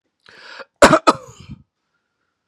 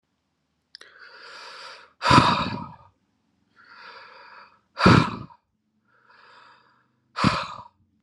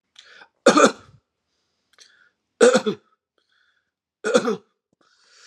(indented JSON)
{
  "cough_length": "2.5 s",
  "cough_amplitude": 32768,
  "cough_signal_mean_std_ratio": 0.25,
  "exhalation_length": "8.0 s",
  "exhalation_amplitude": 29610,
  "exhalation_signal_mean_std_ratio": 0.3,
  "three_cough_length": "5.5 s",
  "three_cough_amplitude": 30393,
  "three_cough_signal_mean_std_ratio": 0.28,
  "survey_phase": "alpha (2021-03-01 to 2021-08-12)",
  "age": "18-44",
  "gender": "Male",
  "wearing_mask": "Yes",
  "symptom_none": true,
  "smoker_status": "Never smoked",
  "respiratory_condition_asthma": false,
  "respiratory_condition_other": false,
  "recruitment_source": "REACT",
  "submission_delay": "3 days",
  "covid_test_result": "Negative",
  "covid_test_method": "RT-qPCR"
}